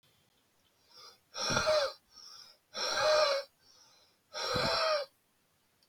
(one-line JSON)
{"exhalation_length": "5.9 s", "exhalation_amplitude": 5994, "exhalation_signal_mean_std_ratio": 0.51, "survey_phase": "beta (2021-08-13 to 2022-03-07)", "age": "45-64", "gender": "Male", "wearing_mask": "No", "symptom_none": true, "smoker_status": "Current smoker (11 or more cigarettes per day)", "respiratory_condition_asthma": false, "respiratory_condition_other": false, "recruitment_source": "REACT", "submission_delay": "1 day", "covid_test_result": "Negative", "covid_test_method": "RT-qPCR", "influenza_a_test_result": "Unknown/Void", "influenza_b_test_result": "Unknown/Void"}